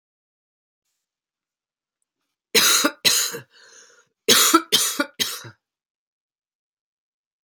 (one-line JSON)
{"cough_length": "7.4 s", "cough_amplitude": 30540, "cough_signal_mean_std_ratio": 0.33, "survey_phase": "alpha (2021-03-01 to 2021-08-12)", "age": "45-64", "gender": "Female", "wearing_mask": "No", "symptom_fatigue": true, "symptom_headache": true, "symptom_onset": "6 days", "smoker_status": "Ex-smoker", "respiratory_condition_asthma": false, "respiratory_condition_other": false, "recruitment_source": "Test and Trace", "submission_delay": "1 day", "covid_test_result": "Positive", "covid_test_method": "RT-qPCR"}